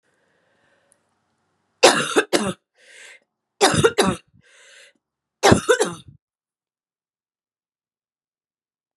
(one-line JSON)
{"three_cough_length": "9.0 s", "three_cough_amplitude": 32767, "three_cough_signal_mean_std_ratio": 0.28, "survey_phase": "beta (2021-08-13 to 2022-03-07)", "age": "45-64", "gender": "Female", "wearing_mask": "No", "symptom_cough_any": true, "symptom_runny_or_blocked_nose": true, "symptom_fatigue": true, "symptom_headache": true, "symptom_onset": "3 days", "smoker_status": "Never smoked", "respiratory_condition_asthma": false, "respiratory_condition_other": false, "recruitment_source": "Test and Trace", "submission_delay": "2 days", "covid_test_result": "Positive", "covid_test_method": "RT-qPCR", "covid_ct_value": 17.7, "covid_ct_gene": "S gene", "covid_ct_mean": 18.3, "covid_viral_load": "1000000 copies/ml", "covid_viral_load_category": "High viral load (>1M copies/ml)"}